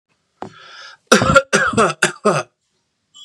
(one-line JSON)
{"three_cough_length": "3.2 s", "three_cough_amplitude": 32768, "three_cough_signal_mean_std_ratio": 0.43, "survey_phase": "beta (2021-08-13 to 2022-03-07)", "age": "18-44", "gender": "Male", "wearing_mask": "No", "symptom_none": true, "smoker_status": "Never smoked", "respiratory_condition_asthma": false, "respiratory_condition_other": false, "recruitment_source": "REACT", "submission_delay": "1 day", "covid_test_result": "Negative", "covid_test_method": "RT-qPCR", "influenza_a_test_result": "Negative", "influenza_b_test_result": "Negative"}